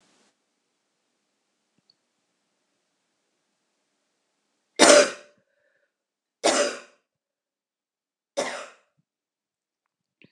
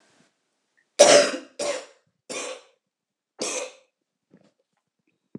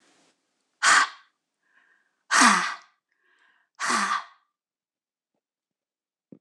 {
  "three_cough_length": "10.3 s",
  "three_cough_amplitude": 26028,
  "three_cough_signal_mean_std_ratio": 0.19,
  "cough_length": "5.4 s",
  "cough_amplitude": 26028,
  "cough_signal_mean_std_ratio": 0.26,
  "exhalation_length": "6.4 s",
  "exhalation_amplitude": 23588,
  "exhalation_signal_mean_std_ratio": 0.31,
  "survey_phase": "beta (2021-08-13 to 2022-03-07)",
  "age": "45-64",
  "gender": "Female",
  "wearing_mask": "No",
  "symptom_cough_any": true,
  "smoker_status": "Never smoked",
  "respiratory_condition_asthma": false,
  "respiratory_condition_other": false,
  "recruitment_source": "Test and Trace",
  "submission_delay": "2 days",
  "covid_test_result": "Positive",
  "covid_test_method": "RT-qPCR",
  "covid_ct_value": 30.8,
  "covid_ct_gene": "ORF1ab gene",
  "covid_ct_mean": 31.6,
  "covid_viral_load": "44 copies/ml",
  "covid_viral_load_category": "Minimal viral load (< 10K copies/ml)"
}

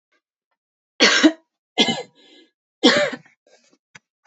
{
  "three_cough_length": "4.3 s",
  "three_cough_amplitude": 29818,
  "three_cough_signal_mean_std_ratio": 0.33,
  "survey_phase": "beta (2021-08-13 to 2022-03-07)",
  "age": "18-44",
  "gender": "Female",
  "wearing_mask": "No",
  "symptom_cough_any": true,
  "symptom_runny_or_blocked_nose": true,
  "symptom_fatigue": true,
  "symptom_fever_high_temperature": true,
  "symptom_other": true,
  "smoker_status": "Never smoked",
  "respiratory_condition_asthma": false,
  "respiratory_condition_other": false,
  "recruitment_source": "Test and Trace",
  "submission_delay": "2 days",
  "covid_test_result": "Positive",
  "covid_test_method": "RT-qPCR"
}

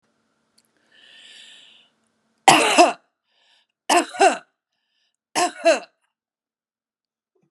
{
  "three_cough_length": "7.5 s",
  "three_cough_amplitude": 32768,
  "three_cough_signal_mean_std_ratio": 0.29,
  "survey_phase": "beta (2021-08-13 to 2022-03-07)",
  "age": "65+",
  "gender": "Female",
  "wearing_mask": "No",
  "symptom_runny_or_blocked_nose": true,
  "symptom_headache": true,
  "smoker_status": "Never smoked",
  "respiratory_condition_asthma": false,
  "respiratory_condition_other": false,
  "recruitment_source": "REACT",
  "submission_delay": "2 days",
  "covid_test_result": "Negative",
  "covid_test_method": "RT-qPCR"
}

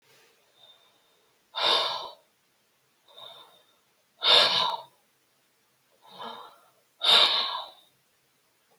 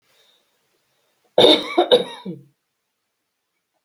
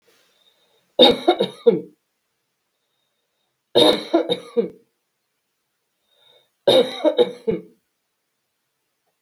{
  "exhalation_length": "8.8 s",
  "exhalation_amplitude": 17262,
  "exhalation_signal_mean_std_ratio": 0.34,
  "cough_length": "3.8 s",
  "cough_amplitude": 32768,
  "cough_signal_mean_std_ratio": 0.29,
  "three_cough_length": "9.2 s",
  "three_cough_amplitude": 32768,
  "three_cough_signal_mean_std_ratio": 0.32,
  "survey_phase": "beta (2021-08-13 to 2022-03-07)",
  "age": "65+",
  "gender": "Female",
  "wearing_mask": "No",
  "symptom_none": true,
  "smoker_status": "Ex-smoker",
  "respiratory_condition_asthma": false,
  "respiratory_condition_other": false,
  "recruitment_source": "REACT",
  "submission_delay": "2 days",
  "covid_test_result": "Negative",
  "covid_test_method": "RT-qPCR",
  "influenza_a_test_result": "Negative",
  "influenza_b_test_result": "Negative"
}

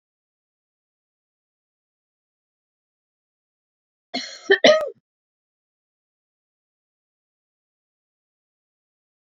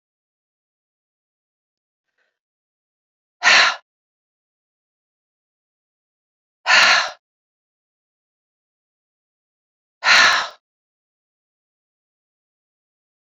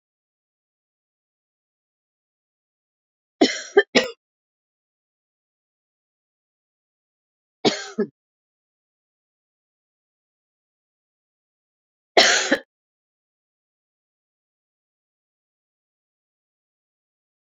{
  "cough_length": "9.3 s",
  "cough_amplitude": 27393,
  "cough_signal_mean_std_ratio": 0.15,
  "exhalation_length": "13.3 s",
  "exhalation_amplitude": 31323,
  "exhalation_signal_mean_std_ratio": 0.23,
  "three_cough_length": "17.4 s",
  "three_cough_amplitude": 27412,
  "three_cough_signal_mean_std_ratio": 0.16,
  "survey_phase": "beta (2021-08-13 to 2022-03-07)",
  "age": "65+",
  "gender": "Female",
  "wearing_mask": "No",
  "symptom_headache": true,
  "smoker_status": "Ex-smoker",
  "respiratory_condition_asthma": false,
  "respiratory_condition_other": false,
  "recruitment_source": "REACT",
  "submission_delay": "2 days",
  "covid_test_result": "Negative",
  "covid_test_method": "RT-qPCR",
  "influenza_a_test_result": "Negative",
  "influenza_b_test_result": "Negative"
}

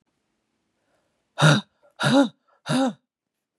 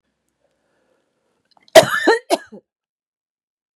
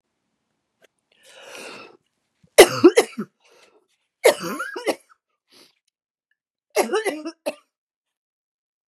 {
  "exhalation_length": "3.6 s",
  "exhalation_amplitude": 21855,
  "exhalation_signal_mean_std_ratio": 0.36,
  "cough_length": "3.8 s",
  "cough_amplitude": 32768,
  "cough_signal_mean_std_ratio": 0.23,
  "three_cough_length": "8.9 s",
  "three_cough_amplitude": 32768,
  "three_cough_signal_mean_std_ratio": 0.23,
  "survey_phase": "beta (2021-08-13 to 2022-03-07)",
  "age": "45-64",
  "gender": "Female",
  "wearing_mask": "No",
  "symptom_cough_any": true,
  "symptom_runny_or_blocked_nose": true,
  "symptom_sore_throat": true,
  "symptom_fatigue": true,
  "symptom_headache": true,
  "symptom_onset": "4 days",
  "smoker_status": "Ex-smoker",
  "respiratory_condition_asthma": true,
  "respiratory_condition_other": false,
  "recruitment_source": "Test and Trace",
  "submission_delay": "2 days",
  "covid_test_result": "Positive",
  "covid_test_method": "RT-qPCR",
  "covid_ct_value": 16.4,
  "covid_ct_gene": "ORF1ab gene",
  "covid_ct_mean": 16.6,
  "covid_viral_load": "3700000 copies/ml",
  "covid_viral_load_category": "High viral load (>1M copies/ml)"
}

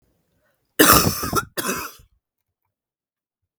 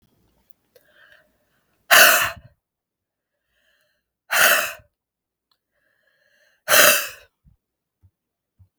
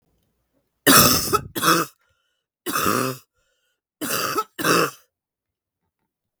{
  "cough_length": "3.6 s",
  "cough_amplitude": 32768,
  "cough_signal_mean_std_ratio": 0.33,
  "exhalation_length": "8.8 s",
  "exhalation_amplitude": 32768,
  "exhalation_signal_mean_std_ratio": 0.27,
  "three_cough_length": "6.4 s",
  "three_cough_amplitude": 32768,
  "three_cough_signal_mean_std_ratio": 0.4,
  "survey_phase": "beta (2021-08-13 to 2022-03-07)",
  "age": "18-44",
  "gender": "Female",
  "wearing_mask": "No",
  "symptom_cough_any": true,
  "symptom_runny_or_blocked_nose": true,
  "symptom_sore_throat": true,
  "symptom_fatigue": true,
  "symptom_headache": true,
  "symptom_change_to_sense_of_smell_or_taste": true,
  "symptom_loss_of_taste": true,
  "symptom_onset": "4 days",
  "smoker_status": "Never smoked",
  "respiratory_condition_asthma": false,
  "respiratory_condition_other": false,
  "recruitment_source": "REACT",
  "submission_delay": "1 day",
  "covid_test_result": "Positive",
  "covid_test_method": "RT-qPCR",
  "covid_ct_value": 19.0,
  "covid_ct_gene": "E gene",
  "influenza_a_test_result": "Negative",
  "influenza_b_test_result": "Negative"
}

